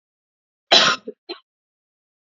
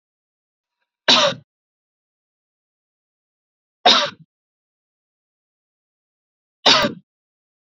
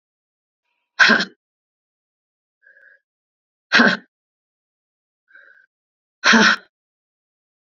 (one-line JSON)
{"cough_length": "2.3 s", "cough_amplitude": 28808, "cough_signal_mean_std_ratio": 0.26, "three_cough_length": "7.8 s", "three_cough_amplitude": 30395, "three_cough_signal_mean_std_ratio": 0.23, "exhalation_length": "7.8 s", "exhalation_amplitude": 29784, "exhalation_signal_mean_std_ratio": 0.25, "survey_phase": "beta (2021-08-13 to 2022-03-07)", "age": "18-44", "gender": "Female", "wearing_mask": "No", "symptom_runny_or_blocked_nose": true, "symptom_sore_throat": true, "symptom_headache": true, "symptom_onset": "2 days", "smoker_status": "Never smoked", "respiratory_condition_asthma": false, "respiratory_condition_other": false, "recruitment_source": "Test and Trace", "submission_delay": "1 day", "covid_test_result": "Positive", "covid_test_method": "RT-qPCR", "covid_ct_value": 26.2, "covid_ct_gene": "ORF1ab gene", "covid_ct_mean": 26.4, "covid_viral_load": "2100 copies/ml", "covid_viral_load_category": "Minimal viral load (< 10K copies/ml)"}